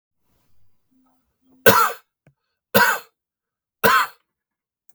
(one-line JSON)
{"three_cough_length": "4.9 s", "three_cough_amplitude": 32768, "three_cough_signal_mean_std_ratio": 0.3, "survey_phase": "beta (2021-08-13 to 2022-03-07)", "age": "45-64", "gender": "Male", "wearing_mask": "No", "symptom_new_continuous_cough": true, "symptom_runny_or_blocked_nose": true, "symptom_headache": true, "symptom_change_to_sense_of_smell_or_taste": true, "symptom_loss_of_taste": true, "smoker_status": "Current smoker (1 to 10 cigarettes per day)", "respiratory_condition_asthma": false, "respiratory_condition_other": false, "recruitment_source": "Test and Trace", "submission_delay": "2 days", "covid_test_result": "Positive", "covid_test_method": "RT-qPCR", "covid_ct_value": 18.1, "covid_ct_gene": "ORF1ab gene", "covid_ct_mean": 18.4, "covid_viral_load": "900000 copies/ml", "covid_viral_load_category": "Low viral load (10K-1M copies/ml)"}